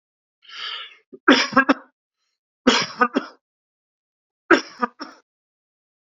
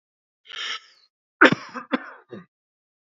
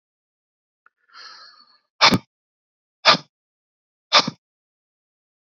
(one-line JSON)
{"three_cough_length": "6.1 s", "three_cough_amplitude": 30983, "three_cough_signal_mean_std_ratio": 0.29, "cough_length": "3.2 s", "cough_amplitude": 28523, "cough_signal_mean_std_ratio": 0.23, "exhalation_length": "5.5 s", "exhalation_amplitude": 31001, "exhalation_signal_mean_std_ratio": 0.21, "survey_phase": "beta (2021-08-13 to 2022-03-07)", "age": "45-64", "gender": "Male", "wearing_mask": "No", "symptom_none": true, "smoker_status": "Never smoked", "respiratory_condition_asthma": false, "respiratory_condition_other": false, "recruitment_source": "REACT", "submission_delay": "1 day", "covid_test_result": "Negative", "covid_test_method": "RT-qPCR", "influenza_a_test_result": "Negative", "influenza_b_test_result": "Negative"}